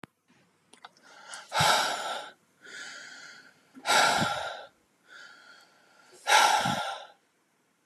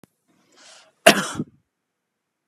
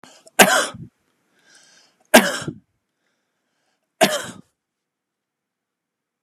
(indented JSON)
{
  "exhalation_length": "7.9 s",
  "exhalation_amplitude": 12229,
  "exhalation_signal_mean_std_ratio": 0.43,
  "cough_length": "2.5 s",
  "cough_amplitude": 32768,
  "cough_signal_mean_std_ratio": 0.2,
  "three_cough_length": "6.2 s",
  "three_cough_amplitude": 32768,
  "three_cough_signal_mean_std_ratio": 0.24,
  "survey_phase": "beta (2021-08-13 to 2022-03-07)",
  "age": "45-64",
  "gender": "Male",
  "wearing_mask": "No",
  "symptom_none": true,
  "smoker_status": "Never smoked",
  "respiratory_condition_asthma": false,
  "respiratory_condition_other": false,
  "recruitment_source": "REACT",
  "submission_delay": "2 days",
  "covid_test_result": "Negative",
  "covid_test_method": "RT-qPCR"
}